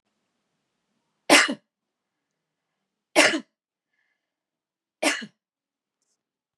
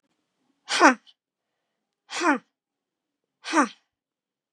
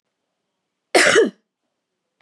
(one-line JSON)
{"three_cough_length": "6.6 s", "three_cough_amplitude": 29759, "three_cough_signal_mean_std_ratio": 0.22, "exhalation_length": "4.5 s", "exhalation_amplitude": 32574, "exhalation_signal_mean_std_ratio": 0.26, "cough_length": "2.2 s", "cough_amplitude": 28720, "cough_signal_mean_std_ratio": 0.32, "survey_phase": "beta (2021-08-13 to 2022-03-07)", "age": "18-44", "gender": "Female", "wearing_mask": "No", "symptom_none": true, "smoker_status": "Never smoked", "respiratory_condition_asthma": false, "respiratory_condition_other": false, "recruitment_source": "REACT", "submission_delay": "2 days", "covid_test_result": "Negative", "covid_test_method": "RT-qPCR", "influenza_a_test_result": "Unknown/Void", "influenza_b_test_result": "Unknown/Void"}